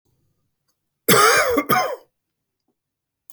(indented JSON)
{
  "cough_length": "3.3 s",
  "cough_amplitude": 32686,
  "cough_signal_mean_std_ratio": 0.4,
  "survey_phase": "beta (2021-08-13 to 2022-03-07)",
  "age": "65+",
  "gender": "Male",
  "wearing_mask": "No",
  "symptom_fatigue": true,
  "smoker_status": "Ex-smoker",
  "respiratory_condition_asthma": false,
  "respiratory_condition_other": false,
  "recruitment_source": "REACT",
  "submission_delay": "1 day",
  "covid_test_result": "Negative",
  "covid_test_method": "RT-qPCR",
  "influenza_a_test_result": "Negative",
  "influenza_b_test_result": "Negative"
}